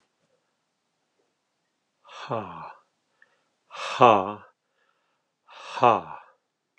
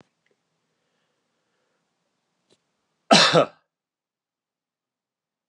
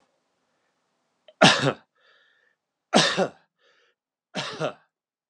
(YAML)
exhalation_length: 6.8 s
exhalation_amplitude: 30326
exhalation_signal_mean_std_ratio: 0.23
cough_length: 5.5 s
cough_amplitude: 26275
cough_signal_mean_std_ratio: 0.19
three_cough_length: 5.3 s
three_cough_amplitude: 30628
three_cough_signal_mean_std_ratio: 0.28
survey_phase: beta (2021-08-13 to 2022-03-07)
age: 45-64
gender: Male
wearing_mask: 'No'
symptom_none: true
smoker_status: Ex-smoker
respiratory_condition_asthma: false
respiratory_condition_other: false
recruitment_source: REACT
submission_delay: 0 days
covid_test_result: Negative
covid_test_method: RT-qPCR